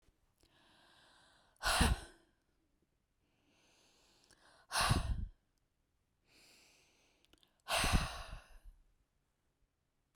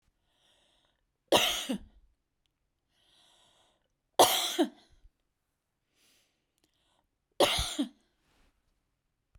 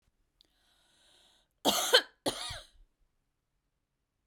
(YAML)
exhalation_length: 10.2 s
exhalation_amplitude: 5619
exhalation_signal_mean_std_ratio: 0.3
three_cough_length: 9.4 s
three_cough_amplitude: 14998
three_cough_signal_mean_std_ratio: 0.26
cough_length: 4.3 s
cough_amplitude: 13169
cough_signal_mean_std_ratio: 0.25
survey_phase: beta (2021-08-13 to 2022-03-07)
age: 65+
gender: Female
wearing_mask: 'No'
symptom_none: true
symptom_onset: 6 days
smoker_status: Never smoked
respiratory_condition_asthma: false
respiratory_condition_other: false
recruitment_source: REACT
submission_delay: 1 day
covid_test_result: Negative
covid_test_method: RT-qPCR
influenza_a_test_result: Negative
influenza_b_test_result: Negative